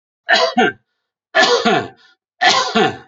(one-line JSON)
{"three_cough_length": "3.1 s", "three_cough_amplitude": 31080, "three_cough_signal_mean_std_ratio": 0.57, "survey_phase": "beta (2021-08-13 to 2022-03-07)", "age": "45-64", "gender": "Male", "wearing_mask": "No", "symptom_cough_any": true, "smoker_status": "Never smoked", "respiratory_condition_asthma": false, "respiratory_condition_other": false, "recruitment_source": "Test and Trace", "submission_delay": "2 days", "covid_test_result": "Positive", "covid_test_method": "LFT"}